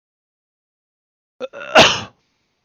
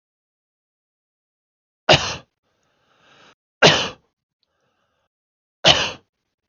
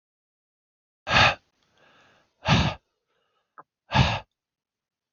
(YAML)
cough_length: 2.6 s
cough_amplitude: 32768
cough_signal_mean_std_ratio: 0.25
three_cough_length: 6.5 s
three_cough_amplitude: 32768
three_cough_signal_mean_std_ratio: 0.23
exhalation_length: 5.1 s
exhalation_amplitude: 23312
exhalation_signal_mean_std_ratio: 0.3
survey_phase: beta (2021-08-13 to 2022-03-07)
age: 18-44
gender: Male
wearing_mask: 'No'
symptom_none: true
smoker_status: Never smoked
respiratory_condition_asthma: false
respiratory_condition_other: false
recruitment_source: REACT
submission_delay: 1 day
covid_test_result: Negative
covid_test_method: RT-qPCR
influenza_a_test_result: Negative
influenza_b_test_result: Negative